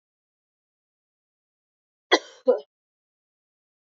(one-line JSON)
{"cough_length": "3.9 s", "cough_amplitude": 20000, "cough_signal_mean_std_ratio": 0.16, "survey_phase": "beta (2021-08-13 to 2022-03-07)", "age": "18-44", "gender": "Female", "wearing_mask": "No", "symptom_cough_any": true, "symptom_runny_or_blocked_nose": true, "symptom_fatigue": true, "symptom_headache": true, "symptom_change_to_sense_of_smell_or_taste": true, "symptom_loss_of_taste": true, "symptom_onset": "3 days", "smoker_status": "Ex-smoker", "respiratory_condition_asthma": false, "respiratory_condition_other": false, "recruitment_source": "Test and Trace", "submission_delay": "2 days", "covid_test_result": "Positive", "covid_test_method": "RT-qPCR", "covid_ct_value": 33.8, "covid_ct_gene": "ORF1ab gene"}